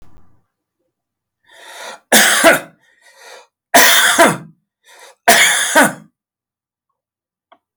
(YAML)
three_cough_length: 7.8 s
three_cough_amplitude: 32768
three_cough_signal_mean_std_ratio: 0.4
survey_phase: alpha (2021-03-01 to 2021-08-12)
age: 65+
gender: Male
wearing_mask: 'No'
symptom_none: true
smoker_status: Ex-smoker
respiratory_condition_asthma: false
respiratory_condition_other: false
recruitment_source: REACT
submission_delay: 1 day
covid_test_result: Negative
covid_test_method: RT-qPCR